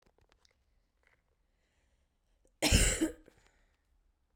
{"cough_length": "4.4 s", "cough_amplitude": 7859, "cough_signal_mean_std_ratio": 0.26, "survey_phase": "beta (2021-08-13 to 2022-03-07)", "age": "18-44", "gender": "Female", "wearing_mask": "No", "symptom_cough_any": true, "symptom_runny_or_blocked_nose": true, "symptom_shortness_of_breath": true, "symptom_diarrhoea": true, "symptom_fatigue": true, "symptom_headache": true, "symptom_change_to_sense_of_smell_or_taste": true, "symptom_loss_of_taste": true, "symptom_other": true, "symptom_onset": "4 days", "smoker_status": "Current smoker (e-cigarettes or vapes only)", "respiratory_condition_asthma": false, "respiratory_condition_other": false, "recruitment_source": "Test and Trace", "submission_delay": "2 days", "covid_test_result": "Positive", "covid_test_method": "RT-qPCR", "covid_ct_value": 19.9, "covid_ct_gene": "ORF1ab gene", "covid_ct_mean": 20.6, "covid_viral_load": "170000 copies/ml", "covid_viral_load_category": "Low viral load (10K-1M copies/ml)"}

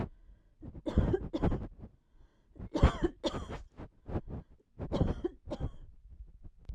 {"three_cough_length": "6.7 s", "three_cough_amplitude": 10887, "three_cough_signal_mean_std_ratio": 0.46, "survey_phase": "beta (2021-08-13 to 2022-03-07)", "age": "45-64", "gender": "Female", "wearing_mask": "No", "symptom_none": true, "smoker_status": "Never smoked", "respiratory_condition_asthma": false, "respiratory_condition_other": false, "recruitment_source": "REACT", "submission_delay": "2 days", "covid_test_result": "Negative", "covid_test_method": "RT-qPCR"}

